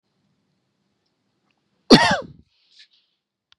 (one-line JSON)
{"cough_length": "3.6 s", "cough_amplitude": 32767, "cough_signal_mean_std_ratio": 0.2, "survey_phase": "beta (2021-08-13 to 2022-03-07)", "age": "18-44", "gender": "Male", "wearing_mask": "No", "symptom_none": true, "smoker_status": "Never smoked", "respiratory_condition_asthma": true, "respiratory_condition_other": false, "recruitment_source": "REACT", "submission_delay": "1 day", "covid_test_result": "Negative", "covid_test_method": "RT-qPCR", "influenza_a_test_result": "Negative", "influenza_b_test_result": "Negative"}